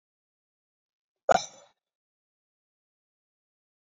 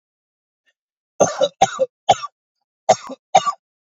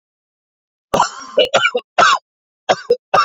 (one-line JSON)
{"exhalation_length": "3.8 s", "exhalation_amplitude": 16808, "exhalation_signal_mean_std_ratio": 0.12, "cough_length": "3.8 s", "cough_amplitude": 32767, "cough_signal_mean_std_ratio": 0.31, "three_cough_length": "3.2 s", "three_cough_amplitude": 30459, "three_cough_signal_mean_std_ratio": 0.44, "survey_phase": "beta (2021-08-13 to 2022-03-07)", "age": "18-44", "gender": "Male", "wearing_mask": "No", "symptom_none": true, "smoker_status": "Current smoker (e-cigarettes or vapes only)", "respiratory_condition_asthma": false, "respiratory_condition_other": false, "recruitment_source": "REACT", "submission_delay": "3 days", "covid_test_result": "Negative", "covid_test_method": "RT-qPCR"}